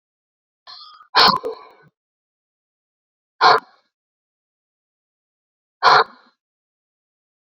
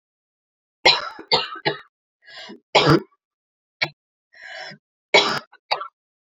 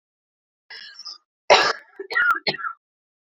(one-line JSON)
{"exhalation_length": "7.4 s", "exhalation_amplitude": 29970, "exhalation_signal_mean_std_ratio": 0.24, "three_cough_length": "6.2 s", "three_cough_amplitude": 28773, "three_cough_signal_mean_std_ratio": 0.32, "cough_length": "3.3 s", "cough_amplitude": 27130, "cough_signal_mean_std_ratio": 0.36, "survey_phase": "beta (2021-08-13 to 2022-03-07)", "age": "18-44", "gender": "Female", "wearing_mask": "No", "symptom_cough_any": true, "symptom_sore_throat": true, "symptom_fatigue": true, "symptom_change_to_sense_of_smell_or_taste": true, "smoker_status": "Ex-smoker", "respiratory_condition_asthma": false, "respiratory_condition_other": false, "recruitment_source": "Test and Trace", "submission_delay": "2 days", "covid_test_result": "Positive", "covid_test_method": "RT-qPCR", "covid_ct_value": 18.0, "covid_ct_gene": "ORF1ab gene", "covid_ct_mean": 18.5, "covid_viral_load": "830000 copies/ml", "covid_viral_load_category": "Low viral load (10K-1M copies/ml)"}